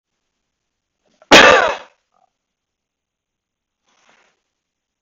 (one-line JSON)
{"cough_length": "5.0 s", "cough_amplitude": 32768, "cough_signal_mean_std_ratio": 0.22, "survey_phase": "beta (2021-08-13 to 2022-03-07)", "age": "65+", "gender": "Male", "wearing_mask": "No", "symptom_runny_or_blocked_nose": true, "symptom_fatigue": true, "symptom_onset": "4 days", "smoker_status": "Never smoked", "respiratory_condition_asthma": false, "respiratory_condition_other": false, "recruitment_source": "REACT", "submission_delay": "0 days", "covid_test_result": "Negative", "covid_test_method": "RT-qPCR", "influenza_a_test_result": "Unknown/Void", "influenza_b_test_result": "Unknown/Void"}